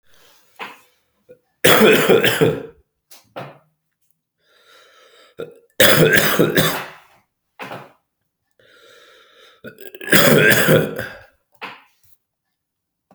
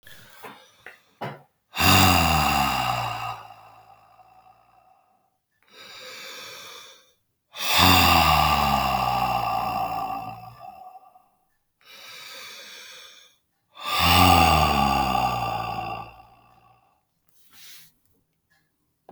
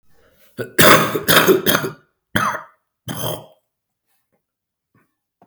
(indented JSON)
{
  "three_cough_length": "13.1 s",
  "three_cough_amplitude": 32768,
  "three_cough_signal_mean_std_ratio": 0.39,
  "exhalation_length": "19.1 s",
  "exhalation_amplitude": 25315,
  "exhalation_signal_mean_std_ratio": 0.49,
  "cough_length": "5.5 s",
  "cough_amplitude": 32768,
  "cough_signal_mean_std_ratio": 0.38,
  "survey_phase": "beta (2021-08-13 to 2022-03-07)",
  "age": "45-64",
  "gender": "Male",
  "wearing_mask": "No",
  "symptom_cough_any": true,
  "symptom_runny_or_blocked_nose": true,
  "symptom_sore_throat": true,
  "symptom_diarrhoea": true,
  "symptom_fever_high_temperature": true,
  "symptom_headache": true,
  "symptom_onset": "3 days",
  "smoker_status": "Ex-smoker",
  "respiratory_condition_asthma": false,
  "respiratory_condition_other": false,
  "recruitment_source": "Test and Trace",
  "submission_delay": "2 days",
  "covid_test_result": "Positive",
  "covid_test_method": "RT-qPCR"
}